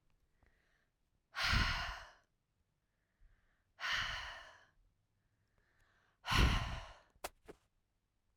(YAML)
exhalation_length: 8.4 s
exhalation_amplitude: 4250
exhalation_signal_mean_std_ratio: 0.35
survey_phase: alpha (2021-03-01 to 2021-08-12)
age: 18-44
gender: Female
wearing_mask: 'No'
symptom_none: true
symptom_onset: 12 days
smoker_status: Ex-smoker
respiratory_condition_asthma: false
respiratory_condition_other: false
recruitment_source: REACT
submission_delay: 1 day
covid_test_result: Negative
covid_test_method: RT-qPCR